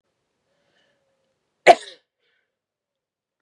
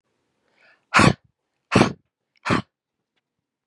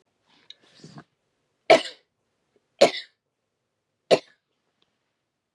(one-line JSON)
{"cough_length": "3.4 s", "cough_amplitude": 32768, "cough_signal_mean_std_ratio": 0.12, "exhalation_length": "3.7 s", "exhalation_amplitude": 29749, "exhalation_signal_mean_std_ratio": 0.27, "three_cough_length": "5.5 s", "three_cough_amplitude": 29758, "three_cough_signal_mean_std_ratio": 0.18, "survey_phase": "beta (2021-08-13 to 2022-03-07)", "age": "45-64", "gender": "Female", "wearing_mask": "No", "symptom_runny_or_blocked_nose": true, "symptom_onset": "5 days", "smoker_status": "Never smoked", "respiratory_condition_asthma": false, "respiratory_condition_other": false, "recruitment_source": "Test and Trace", "submission_delay": "1 day", "covid_test_result": "Positive", "covid_test_method": "ePCR"}